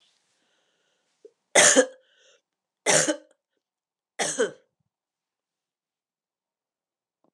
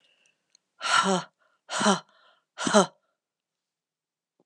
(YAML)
three_cough_length: 7.3 s
three_cough_amplitude: 23547
three_cough_signal_mean_std_ratio: 0.25
exhalation_length: 4.5 s
exhalation_amplitude: 20050
exhalation_signal_mean_std_ratio: 0.33
survey_phase: alpha (2021-03-01 to 2021-08-12)
age: 45-64
gender: Female
wearing_mask: 'No'
symptom_cough_any: true
symptom_fatigue: true
symptom_change_to_sense_of_smell_or_taste: true
smoker_status: Never smoked
respiratory_condition_asthma: false
respiratory_condition_other: false
recruitment_source: Test and Trace
submission_delay: 2 days
covid_test_result: Positive
covid_test_method: RT-qPCR